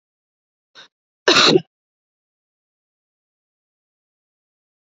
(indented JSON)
{
  "cough_length": "4.9 s",
  "cough_amplitude": 31389,
  "cough_signal_mean_std_ratio": 0.2,
  "survey_phase": "beta (2021-08-13 to 2022-03-07)",
  "age": "18-44",
  "gender": "Female",
  "wearing_mask": "No",
  "symptom_cough_any": true,
  "symptom_runny_or_blocked_nose": true,
  "symptom_sore_throat": true,
  "symptom_fatigue": true,
  "symptom_headache": true,
  "symptom_onset": "6 days",
  "smoker_status": "Never smoked",
  "respiratory_condition_asthma": false,
  "respiratory_condition_other": false,
  "recruitment_source": "Test and Trace",
  "submission_delay": "1 day",
  "covid_test_result": "Positive",
  "covid_test_method": "ePCR"
}